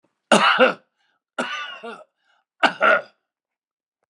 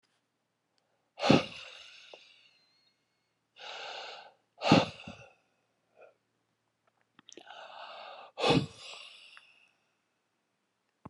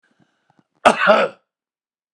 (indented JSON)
{
  "three_cough_length": "4.1 s",
  "three_cough_amplitude": 31254,
  "three_cough_signal_mean_std_ratio": 0.37,
  "exhalation_length": "11.1 s",
  "exhalation_amplitude": 14485,
  "exhalation_signal_mean_std_ratio": 0.25,
  "cough_length": "2.1 s",
  "cough_amplitude": 32768,
  "cough_signal_mean_std_ratio": 0.32,
  "survey_phase": "beta (2021-08-13 to 2022-03-07)",
  "age": "45-64",
  "gender": "Male",
  "wearing_mask": "No",
  "symptom_none": true,
  "smoker_status": "Ex-smoker",
  "respiratory_condition_asthma": false,
  "respiratory_condition_other": false,
  "recruitment_source": "REACT",
  "submission_delay": "3 days",
  "covid_test_result": "Negative",
  "covid_test_method": "RT-qPCR",
  "influenza_a_test_result": "Negative",
  "influenza_b_test_result": "Negative"
}